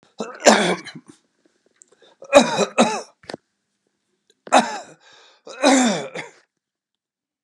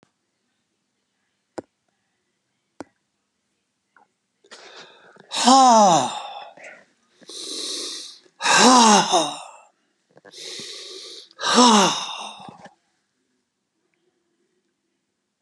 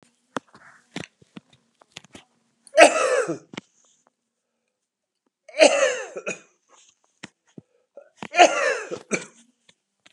{"cough_length": "7.4 s", "cough_amplitude": 32768, "cough_signal_mean_std_ratio": 0.35, "exhalation_length": "15.4 s", "exhalation_amplitude": 28821, "exhalation_signal_mean_std_ratio": 0.34, "three_cough_length": "10.1 s", "three_cough_amplitude": 32766, "three_cough_signal_mean_std_ratio": 0.28, "survey_phase": "beta (2021-08-13 to 2022-03-07)", "age": "65+", "gender": "Male", "wearing_mask": "No", "symptom_cough_any": true, "symptom_runny_or_blocked_nose": true, "symptom_onset": "2 days", "smoker_status": "Never smoked", "respiratory_condition_asthma": true, "respiratory_condition_other": true, "recruitment_source": "REACT", "submission_delay": "4 days", "covid_test_result": "Negative", "covid_test_method": "RT-qPCR", "influenza_a_test_result": "Negative", "influenza_b_test_result": "Negative"}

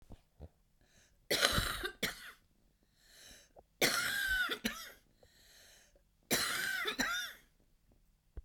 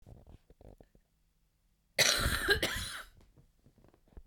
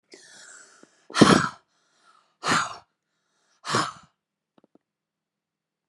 {"three_cough_length": "8.4 s", "three_cough_amplitude": 13512, "three_cough_signal_mean_std_ratio": 0.48, "cough_length": "4.3 s", "cough_amplitude": 7974, "cough_signal_mean_std_ratio": 0.37, "exhalation_length": "5.9 s", "exhalation_amplitude": 31986, "exhalation_signal_mean_std_ratio": 0.25, "survey_phase": "beta (2021-08-13 to 2022-03-07)", "age": "45-64", "gender": "Female", "wearing_mask": "No", "symptom_cough_any": true, "symptom_runny_or_blocked_nose": true, "symptom_sore_throat": true, "symptom_fatigue": true, "symptom_onset": "3 days", "smoker_status": "Ex-smoker", "respiratory_condition_asthma": true, "respiratory_condition_other": false, "recruitment_source": "Test and Trace", "submission_delay": "1 day", "covid_test_result": "Positive", "covid_test_method": "RT-qPCR", "covid_ct_value": 14.0, "covid_ct_gene": "ORF1ab gene"}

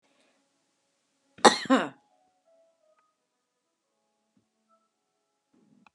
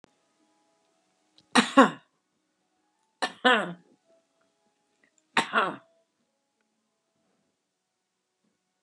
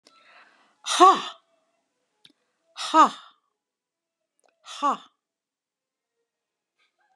{"cough_length": "5.9 s", "cough_amplitude": 31357, "cough_signal_mean_std_ratio": 0.15, "three_cough_length": "8.8 s", "three_cough_amplitude": 26846, "three_cough_signal_mean_std_ratio": 0.21, "exhalation_length": "7.2 s", "exhalation_amplitude": 25567, "exhalation_signal_mean_std_ratio": 0.23, "survey_phase": "beta (2021-08-13 to 2022-03-07)", "age": "65+", "gender": "Female", "wearing_mask": "No", "symptom_headache": true, "smoker_status": "Ex-smoker", "respiratory_condition_asthma": false, "respiratory_condition_other": false, "recruitment_source": "REACT", "submission_delay": "2 days", "covid_test_result": "Negative", "covid_test_method": "RT-qPCR", "influenza_a_test_result": "Negative", "influenza_b_test_result": "Negative"}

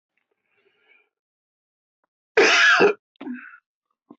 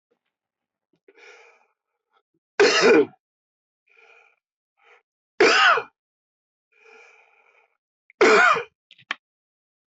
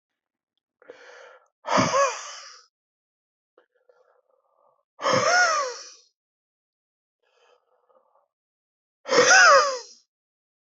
{"cough_length": "4.2 s", "cough_amplitude": 20643, "cough_signal_mean_std_ratio": 0.33, "three_cough_length": "10.0 s", "three_cough_amplitude": 19870, "three_cough_signal_mean_std_ratio": 0.3, "exhalation_length": "10.7 s", "exhalation_amplitude": 19958, "exhalation_signal_mean_std_ratio": 0.33, "survey_phase": "beta (2021-08-13 to 2022-03-07)", "age": "65+", "gender": "Male", "wearing_mask": "Yes", "symptom_cough_any": true, "symptom_diarrhoea": true, "smoker_status": "Ex-smoker", "respiratory_condition_asthma": false, "respiratory_condition_other": false, "recruitment_source": "Test and Trace", "submission_delay": "1 day", "covid_test_result": "Positive", "covid_test_method": "LFT"}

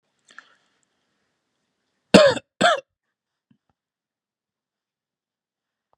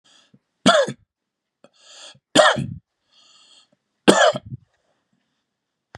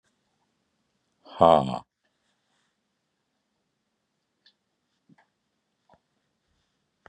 {"cough_length": "6.0 s", "cough_amplitude": 32768, "cough_signal_mean_std_ratio": 0.19, "three_cough_length": "6.0 s", "three_cough_amplitude": 32768, "three_cough_signal_mean_std_ratio": 0.29, "exhalation_length": "7.1 s", "exhalation_amplitude": 25242, "exhalation_signal_mean_std_ratio": 0.14, "survey_phase": "beta (2021-08-13 to 2022-03-07)", "age": "45-64", "gender": "Male", "wearing_mask": "No", "symptom_none": true, "smoker_status": "Never smoked", "respiratory_condition_asthma": false, "respiratory_condition_other": false, "recruitment_source": "REACT", "submission_delay": "5 days", "covid_test_result": "Negative", "covid_test_method": "RT-qPCR", "influenza_a_test_result": "Negative", "influenza_b_test_result": "Negative"}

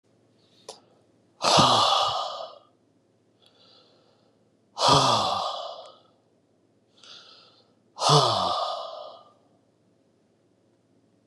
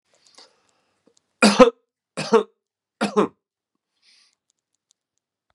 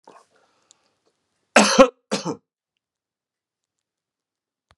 {"exhalation_length": "11.3 s", "exhalation_amplitude": 18235, "exhalation_signal_mean_std_ratio": 0.39, "three_cough_length": "5.5 s", "three_cough_amplitude": 32767, "three_cough_signal_mean_std_ratio": 0.23, "cough_length": "4.8 s", "cough_amplitude": 32767, "cough_signal_mean_std_ratio": 0.21, "survey_phase": "beta (2021-08-13 to 2022-03-07)", "age": "45-64", "gender": "Male", "wearing_mask": "No", "symptom_fatigue": true, "symptom_fever_high_temperature": true, "symptom_headache": true, "symptom_change_to_sense_of_smell_or_taste": true, "symptom_loss_of_taste": true, "symptom_onset": "6 days", "smoker_status": "Ex-smoker", "respiratory_condition_asthma": false, "respiratory_condition_other": false, "recruitment_source": "Test and Trace", "submission_delay": "1 day", "covid_test_result": "Positive", "covid_test_method": "RT-qPCR", "covid_ct_value": 15.5, "covid_ct_gene": "ORF1ab gene"}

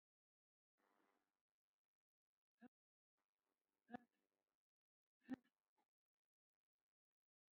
{"exhalation_length": "7.5 s", "exhalation_amplitude": 298, "exhalation_signal_mean_std_ratio": 0.12, "survey_phase": "beta (2021-08-13 to 2022-03-07)", "age": "65+", "gender": "Female", "wearing_mask": "No", "symptom_shortness_of_breath": true, "symptom_loss_of_taste": true, "smoker_status": "Ex-smoker", "respiratory_condition_asthma": false, "respiratory_condition_other": true, "recruitment_source": "REACT", "submission_delay": "5 days", "covid_test_result": "Negative", "covid_test_method": "RT-qPCR", "influenza_a_test_result": "Negative", "influenza_b_test_result": "Negative"}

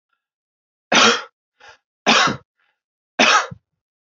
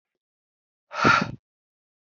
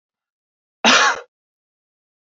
{"three_cough_length": "4.2 s", "three_cough_amplitude": 30160, "three_cough_signal_mean_std_ratio": 0.36, "exhalation_length": "2.1 s", "exhalation_amplitude": 21517, "exhalation_signal_mean_std_ratio": 0.29, "cough_length": "2.2 s", "cough_amplitude": 29310, "cough_signal_mean_std_ratio": 0.3, "survey_phase": "beta (2021-08-13 to 2022-03-07)", "age": "18-44", "gender": "Male", "wearing_mask": "No", "symptom_cough_any": true, "symptom_sore_throat": true, "symptom_other": true, "smoker_status": "Never smoked", "respiratory_condition_asthma": false, "respiratory_condition_other": false, "recruitment_source": "Test and Trace", "submission_delay": "1 day", "covid_test_result": "Positive", "covid_test_method": "RT-qPCR", "covid_ct_value": 35.1, "covid_ct_gene": "ORF1ab gene", "covid_ct_mean": 35.1, "covid_viral_load": "3 copies/ml", "covid_viral_load_category": "Minimal viral load (< 10K copies/ml)"}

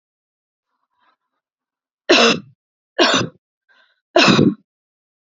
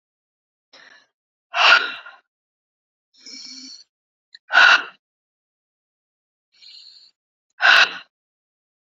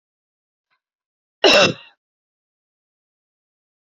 {"three_cough_length": "5.3 s", "three_cough_amplitude": 32089, "three_cough_signal_mean_std_ratio": 0.34, "exhalation_length": "8.9 s", "exhalation_amplitude": 28492, "exhalation_signal_mean_std_ratio": 0.26, "cough_length": "3.9 s", "cough_amplitude": 30044, "cough_signal_mean_std_ratio": 0.21, "survey_phase": "beta (2021-08-13 to 2022-03-07)", "age": "18-44", "gender": "Female", "wearing_mask": "No", "symptom_fatigue": true, "smoker_status": "Never smoked", "respiratory_condition_asthma": false, "respiratory_condition_other": false, "recruitment_source": "REACT", "submission_delay": "1 day", "covid_test_result": "Negative", "covid_test_method": "RT-qPCR"}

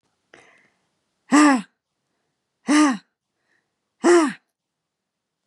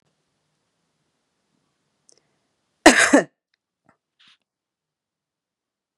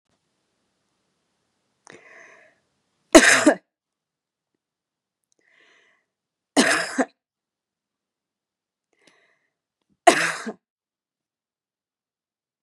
{"exhalation_length": "5.5 s", "exhalation_amplitude": 25279, "exhalation_signal_mean_std_ratio": 0.32, "cough_length": "6.0 s", "cough_amplitude": 32768, "cough_signal_mean_std_ratio": 0.17, "three_cough_length": "12.6 s", "three_cough_amplitude": 32768, "three_cough_signal_mean_std_ratio": 0.2, "survey_phase": "beta (2021-08-13 to 2022-03-07)", "age": "45-64", "gender": "Female", "wearing_mask": "No", "symptom_sore_throat": true, "symptom_fatigue": true, "symptom_headache": true, "symptom_loss_of_taste": true, "smoker_status": "Never smoked", "respiratory_condition_asthma": false, "respiratory_condition_other": false, "recruitment_source": "Test and Trace", "submission_delay": "2 days", "covid_test_result": "Positive", "covid_test_method": "RT-qPCR", "covid_ct_value": 22.2, "covid_ct_gene": "ORF1ab gene", "covid_ct_mean": 22.5, "covid_viral_load": "42000 copies/ml", "covid_viral_load_category": "Low viral load (10K-1M copies/ml)"}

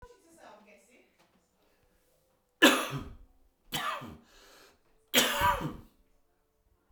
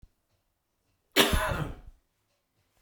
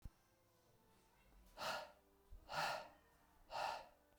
{"three_cough_length": "6.9 s", "three_cough_amplitude": 15148, "three_cough_signal_mean_std_ratio": 0.3, "cough_length": "2.8 s", "cough_amplitude": 18927, "cough_signal_mean_std_ratio": 0.33, "exhalation_length": "4.2 s", "exhalation_amplitude": 922, "exhalation_signal_mean_std_ratio": 0.47, "survey_phase": "beta (2021-08-13 to 2022-03-07)", "age": "45-64", "gender": "Male", "wearing_mask": "No", "symptom_cough_any": true, "symptom_runny_or_blocked_nose": true, "symptom_shortness_of_breath": true, "symptom_sore_throat": true, "symptom_fatigue": true, "symptom_fever_high_temperature": true, "symptom_headache": true, "symptom_change_to_sense_of_smell_or_taste": true, "symptom_loss_of_taste": true, "smoker_status": "Ex-smoker", "respiratory_condition_asthma": false, "respiratory_condition_other": false, "recruitment_source": "Test and Trace", "submission_delay": "2 days", "covid_test_result": "Positive", "covid_test_method": "RT-qPCR", "covid_ct_value": 25.9, "covid_ct_gene": "ORF1ab gene", "covid_ct_mean": 26.3, "covid_viral_load": "2300 copies/ml", "covid_viral_load_category": "Minimal viral load (< 10K copies/ml)"}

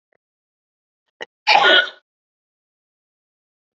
{"cough_length": "3.8 s", "cough_amplitude": 28931, "cough_signal_mean_std_ratio": 0.26, "survey_phase": "beta (2021-08-13 to 2022-03-07)", "age": "18-44", "gender": "Female", "wearing_mask": "No", "symptom_none": true, "symptom_onset": "5 days", "smoker_status": "Ex-smoker", "respiratory_condition_asthma": false, "respiratory_condition_other": false, "recruitment_source": "REACT", "submission_delay": "1 day", "covid_test_result": "Negative", "covid_test_method": "RT-qPCR", "influenza_a_test_result": "Negative", "influenza_b_test_result": "Negative"}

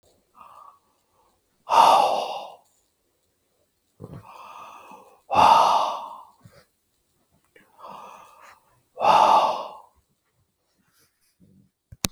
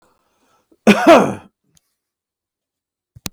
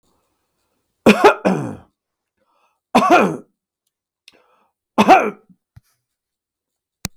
{"exhalation_length": "12.1 s", "exhalation_amplitude": 32767, "exhalation_signal_mean_std_ratio": 0.33, "cough_length": "3.3 s", "cough_amplitude": 32768, "cough_signal_mean_std_ratio": 0.27, "three_cough_length": "7.2 s", "three_cough_amplitude": 32768, "three_cough_signal_mean_std_ratio": 0.3, "survey_phase": "beta (2021-08-13 to 2022-03-07)", "age": "45-64", "gender": "Male", "wearing_mask": "No", "symptom_fatigue": true, "smoker_status": "Ex-smoker", "respiratory_condition_asthma": false, "respiratory_condition_other": false, "recruitment_source": "REACT", "submission_delay": "1 day", "covid_test_result": "Negative", "covid_test_method": "RT-qPCR", "influenza_a_test_result": "Unknown/Void", "influenza_b_test_result": "Unknown/Void"}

